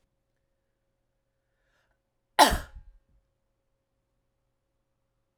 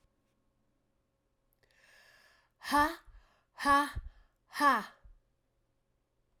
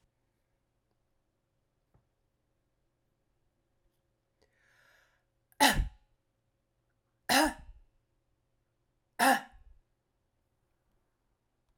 {"cough_length": "5.4 s", "cough_amplitude": 22024, "cough_signal_mean_std_ratio": 0.14, "exhalation_length": "6.4 s", "exhalation_amplitude": 6304, "exhalation_signal_mean_std_ratio": 0.29, "three_cough_length": "11.8 s", "three_cough_amplitude": 12736, "three_cough_signal_mean_std_ratio": 0.2, "survey_phase": "alpha (2021-03-01 to 2021-08-12)", "age": "45-64", "gender": "Female", "wearing_mask": "No", "symptom_change_to_sense_of_smell_or_taste": true, "symptom_loss_of_taste": true, "smoker_status": "Never smoked", "respiratory_condition_asthma": false, "respiratory_condition_other": false, "recruitment_source": "Test and Trace", "submission_delay": "1 day", "covid_test_result": "Positive", "covid_test_method": "RT-qPCR", "covid_ct_value": 17.4, "covid_ct_gene": "ORF1ab gene", "covid_ct_mean": 17.9, "covid_viral_load": "1400000 copies/ml", "covid_viral_load_category": "High viral load (>1M copies/ml)"}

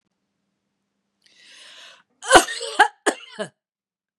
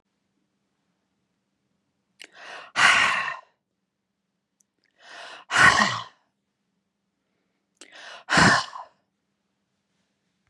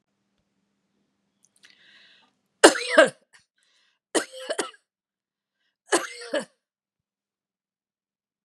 {"cough_length": "4.2 s", "cough_amplitude": 32768, "cough_signal_mean_std_ratio": 0.23, "exhalation_length": "10.5 s", "exhalation_amplitude": 23652, "exhalation_signal_mean_std_ratio": 0.29, "three_cough_length": "8.4 s", "three_cough_amplitude": 32767, "three_cough_signal_mean_std_ratio": 0.2, "survey_phase": "beta (2021-08-13 to 2022-03-07)", "age": "65+", "gender": "Female", "wearing_mask": "No", "symptom_none": true, "smoker_status": "Never smoked", "respiratory_condition_asthma": false, "respiratory_condition_other": false, "recruitment_source": "REACT", "submission_delay": "2 days", "covid_test_result": "Negative", "covid_test_method": "RT-qPCR", "influenza_a_test_result": "Negative", "influenza_b_test_result": "Negative"}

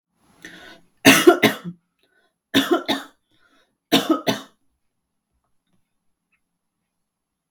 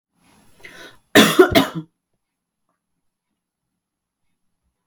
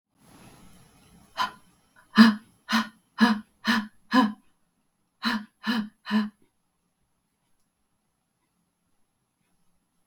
{"three_cough_length": "7.5 s", "three_cough_amplitude": 32768, "three_cough_signal_mean_std_ratio": 0.27, "cough_length": "4.9 s", "cough_amplitude": 32768, "cough_signal_mean_std_ratio": 0.24, "exhalation_length": "10.1 s", "exhalation_amplitude": 25447, "exhalation_signal_mean_std_ratio": 0.29, "survey_phase": "beta (2021-08-13 to 2022-03-07)", "age": "18-44", "gender": "Female", "wearing_mask": "No", "symptom_none": true, "symptom_onset": "6 days", "smoker_status": "Never smoked", "respiratory_condition_asthma": false, "respiratory_condition_other": false, "recruitment_source": "Test and Trace", "submission_delay": "1 day", "covid_test_result": "Positive", "covid_test_method": "ePCR"}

